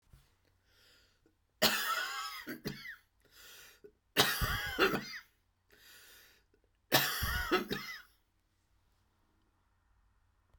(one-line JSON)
{"three_cough_length": "10.6 s", "three_cough_amplitude": 9467, "three_cough_signal_mean_std_ratio": 0.39, "survey_phase": "beta (2021-08-13 to 2022-03-07)", "age": "65+", "gender": "Female", "wearing_mask": "No", "symptom_cough_any": true, "symptom_diarrhoea": true, "symptom_fatigue": true, "symptom_onset": "12 days", "smoker_status": "Ex-smoker", "respiratory_condition_asthma": false, "respiratory_condition_other": false, "recruitment_source": "REACT", "submission_delay": "1 day", "covid_test_result": "Negative", "covid_test_method": "RT-qPCR"}